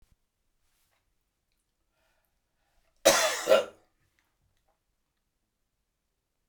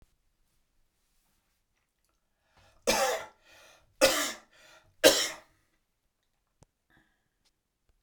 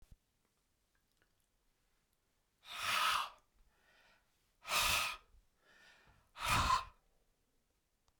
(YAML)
cough_length: 6.5 s
cough_amplitude: 18448
cough_signal_mean_std_ratio: 0.21
three_cough_length: 8.0 s
three_cough_amplitude: 18449
three_cough_signal_mean_std_ratio: 0.24
exhalation_length: 8.2 s
exhalation_amplitude: 3133
exhalation_signal_mean_std_ratio: 0.35
survey_phase: beta (2021-08-13 to 2022-03-07)
age: 65+
gender: Male
wearing_mask: 'No'
symptom_none: true
smoker_status: Never smoked
respiratory_condition_asthma: false
respiratory_condition_other: false
recruitment_source: REACT
submission_delay: 1 day
covid_test_result: Negative
covid_test_method: RT-qPCR